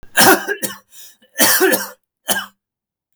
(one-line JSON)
{"cough_length": "3.2 s", "cough_amplitude": 32767, "cough_signal_mean_std_ratio": 0.46, "survey_phase": "beta (2021-08-13 to 2022-03-07)", "age": "45-64", "gender": "Male", "wearing_mask": "No", "symptom_cough_any": true, "symptom_sore_throat": true, "smoker_status": "Never smoked", "respiratory_condition_asthma": false, "respiratory_condition_other": false, "recruitment_source": "Test and Trace", "submission_delay": "1 day", "covid_test_result": "Positive", "covid_test_method": "RT-qPCR", "covid_ct_value": 19.3, "covid_ct_gene": "N gene"}